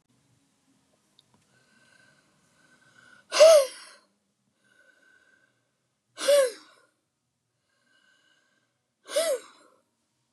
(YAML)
exhalation_length: 10.3 s
exhalation_amplitude: 17520
exhalation_signal_mean_std_ratio: 0.22
survey_phase: beta (2021-08-13 to 2022-03-07)
age: 45-64
gender: Female
wearing_mask: 'No'
symptom_cough_any: true
symptom_runny_or_blocked_nose: true
symptom_sore_throat: true
symptom_fatigue: true
symptom_headache: true
symptom_onset: 11 days
smoker_status: Never smoked
respiratory_condition_asthma: false
respiratory_condition_other: false
recruitment_source: REACT
submission_delay: 2 days
covid_test_result: Negative
covid_test_method: RT-qPCR
influenza_a_test_result: Negative
influenza_b_test_result: Negative